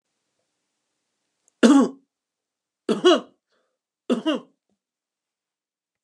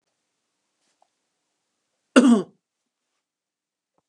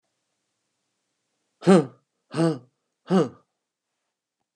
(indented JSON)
{
  "three_cough_length": "6.0 s",
  "three_cough_amplitude": 28345,
  "three_cough_signal_mean_std_ratio": 0.27,
  "cough_length": "4.1 s",
  "cough_amplitude": 29534,
  "cough_signal_mean_std_ratio": 0.2,
  "exhalation_length": "4.6 s",
  "exhalation_amplitude": 21479,
  "exhalation_signal_mean_std_ratio": 0.26,
  "survey_phase": "beta (2021-08-13 to 2022-03-07)",
  "age": "65+",
  "gender": "Male",
  "wearing_mask": "No",
  "symptom_none": true,
  "smoker_status": "Current smoker (11 or more cigarettes per day)",
  "respiratory_condition_asthma": false,
  "respiratory_condition_other": false,
  "recruitment_source": "REACT",
  "submission_delay": "1 day",
  "covid_test_result": "Negative",
  "covid_test_method": "RT-qPCR"
}